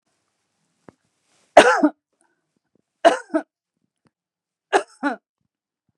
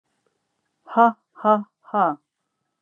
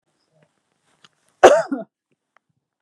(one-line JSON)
{"three_cough_length": "6.0 s", "three_cough_amplitude": 32768, "three_cough_signal_mean_std_ratio": 0.23, "exhalation_length": "2.8 s", "exhalation_amplitude": 22363, "exhalation_signal_mean_std_ratio": 0.32, "cough_length": "2.8 s", "cough_amplitude": 32768, "cough_signal_mean_std_ratio": 0.22, "survey_phase": "beta (2021-08-13 to 2022-03-07)", "age": "45-64", "gender": "Female", "wearing_mask": "No", "symptom_none": true, "smoker_status": "Ex-smoker", "respiratory_condition_asthma": false, "respiratory_condition_other": false, "recruitment_source": "REACT", "submission_delay": "1 day", "covid_test_result": "Negative", "covid_test_method": "RT-qPCR"}